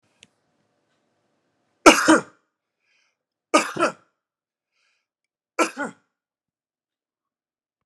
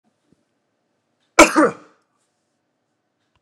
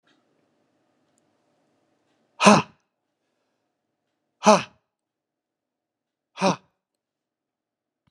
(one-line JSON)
{"three_cough_length": "7.9 s", "three_cough_amplitude": 32768, "three_cough_signal_mean_std_ratio": 0.2, "cough_length": "3.4 s", "cough_amplitude": 32768, "cough_signal_mean_std_ratio": 0.2, "exhalation_length": "8.1 s", "exhalation_amplitude": 31633, "exhalation_signal_mean_std_ratio": 0.17, "survey_phase": "beta (2021-08-13 to 2022-03-07)", "age": "45-64", "gender": "Male", "wearing_mask": "No", "symptom_none": true, "symptom_onset": "3 days", "smoker_status": "Ex-smoker", "respiratory_condition_asthma": false, "respiratory_condition_other": false, "recruitment_source": "REACT", "submission_delay": "3 days", "covid_test_result": "Negative", "covid_test_method": "RT-qPCR"}